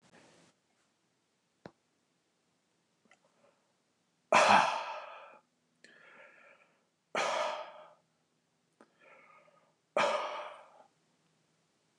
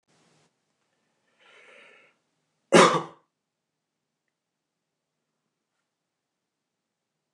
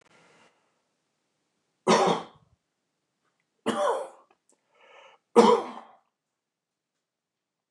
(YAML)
exhalation_length: 12.0 s
exhalation_amplitude: 8391
exhalation_signal_mean_std_ratio: 0.27
cough_length: 7.3 s
cough_amplitude: 26470
cough_signal_mean_std_ratio: 0.15
three_cough_length: 7.7 s
three_cough_amplitude: 21936
three_cough_signal_mean_std_ratio: 0.27
survey_phase: beta (2021-08-13 to 2022-03-07)
age: 65+
gender: Male
wearing_mask: 'No'
symptom_none: true
smoker_status: Ex-smoker
respiratory_condition_asthma: false
respiratory_condition_other: false
recruitment_source: REACT
submission_delay: 3 days
covid_test_result: Negative
covid_test_method: RT-qPCR
influenza_a_test_result: Negative
influenza_b_test_result: Negative